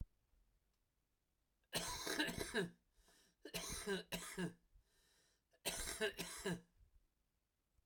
{"three_cough_length": "7.9 s", "three_cough_amplitude": 1816, "three_cough_signal_mean_std_ratio": 0.48, "survey_phase": "beta (2021-08-13 to 2022-03-07)", "age": "45-64", "gender": "Male", "wearing_mask": "No", "symptom_new_continuous_cough": true, "symptom_change_to_sense_of_smell_or_taste": true, "symptom_onset": "5 days", "smoker_status": "Never smoked", "respiratory_condition_asthma": true, "respiratory_condition_other": false, "recruitment_source": "Test and Trace", "submission_delay": "2 days", "covid_test_result": "Positive", "covid_test_method": "RT-qPCR", "covid_ct_value": 21.7, "covid_ct_gene": "ORF1ab gene", "covid_ct_mean": 22.5, "covid_viral_load": "43000 copies/ml", "covid_viral_load_category": "Low viral load (10K-1M copies/ml)"}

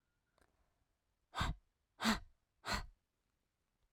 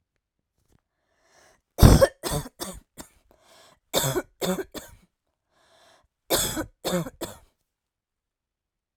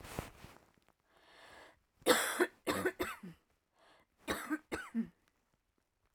{"exhalation_length": "3.9 s", "exhalation_amplitude": 2854, "exhalation_signal_mean_std_ratio": 0.3, "cough_length": "9.0 s", "cough_amplitude": 32768, "cough_signal_mean_std_ratio": 0.26, "three_cough_length": "6.1 s", "three_cough_amplitude": 6100, "three_cough_signal_mean_std_ratio": 0.37, "survey_phase": "alpha (2021-03-01 to 2021-08-12)", "age": "18-44", "gender": "Female", "wearing_mask": "No", "symptom_none": true, "smoker_status": "Prefer not to say", "respiratory_condition_asthma": false, "respiratory_condition_other": false, "recruitment_source": "REACT", "submission_delay": "1 day", "covid_test_result": "Negative", "covid_test_method": "RT-qPCR"}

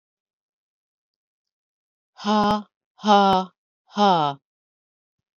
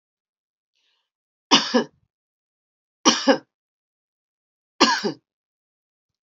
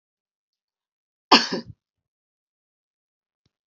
{"exhalation_length": "5.4 s", "exhalation_amplitude": 22310, "exhalation_signal_mean_std_ratio": 0.33, "three_cough_length": "6.2 s", "three_cough_amplitude": 32357, "three_cough_signal_mean_std_ratio": 0.26, "cough_length": "3.7 s", "cough_amplitude": 29840, "cough_signal_mean_std_ratio": 0.16, "survey_phase": "beta (2021-08-13 to 2022-03-07)", "age": "45-64", "gender": "Female", "wearing_mask": "No", "symptom_none": true, "smoker_status": "Never smoked", "respiratory_condition_asthma": false, "respiratory_condition_other": false, "recruitment_source": "REACT", "submission_delay": "6 days", "covid_test_result": "Negative", "covid_test_method": "RT-qPCR"}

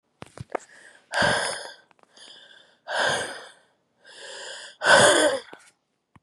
{"exhalation_length": "6.2 s", "exhalation_amplitude": 25964, "exhalation_signal_mean_std_ratio": 0.4, "survey_phase": "beta (2021-08-13 to 2022-03-07)", "age": "18-44", "gender": "Female", "wearing_mask": "No", "symptom_cough_any": true, "symptom_runny_or_blocked_nose": true, "symptom_shortness_of_breath": true, "symptom_sore_throat": true, "symptom_abdominal_pain": true, "symptom_fatigue": true, "symptom_fever_high_temperature": true, "symptom_headache": true, "symptom_change_to_sense_of_smell_or_taste": true, "symptom_loss_of_taste": true, "symptom_onset": "7 days", "smoker_status": "Never smoked", "respiratory_condition_asthma": false, "respiratory_condition_other": false, "recruitment_source": "Test and Trace", "submission_delay": "2 days", "covid_test_result": "Positive", "covid_test_method": "RT-qPCR", "covid_ct_value": 21.4, "covid_ct_gene": "ORF1ab gene"}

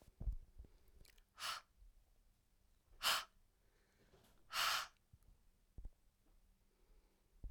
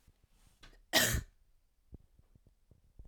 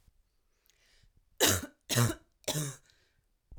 {"exhalation_length": "7.5 s", "exhalation_amplitude": 2243, "exhalation_signal_mean_std_ratio": 0.34, "cough_length": "3.1 s", "cough_amplitude": 9263, "cough_signal_mean_std_ratio": 0.27, "three_cough_length": "3.6 s", "three_cough_amplitude": 9350, "three_cough_signal_mean_std_ratio": 0.35, "survey_phase": "alpha (2021-03-01 to 2021-08-12)", "age": "18-44", "gender": "Female", "wearing_mask": "No", "symptom_none": true, "smoker_status": "Never smoked", "respiratory_condition_asthma": false, "respiratory_condition_other": false, "recruitment_source": "REACT", "submission_delay": "1 day", "covid_test_result": "Negative", "covid_test_method": "RT-qPCR"}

